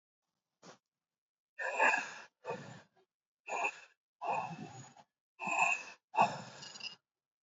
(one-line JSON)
{"exhalation_length": "7.4 s", "exhalation_amplitude": 5370, "exhalation_signal_mean_std_ratio": 0.4, "survey_phase": "beta (2021-08-13 to 2022-03-07)", "age": "45-64", "gender": "Male", "wearing_mask": "Yes", "symptom_none": true, "smoker_status": "Never smoked", "respiratory_condition_asthma": false, "respiratory_condition_other": false, "recruitment_source": "REACT", "submission_delay": "1 day", "covid_test_result": "Negative", "covid_test_method": "RT-qPCR", "influenza_a_test_result": "Unknown/Void", "influenza_b_test_result": "Unknown/Void"}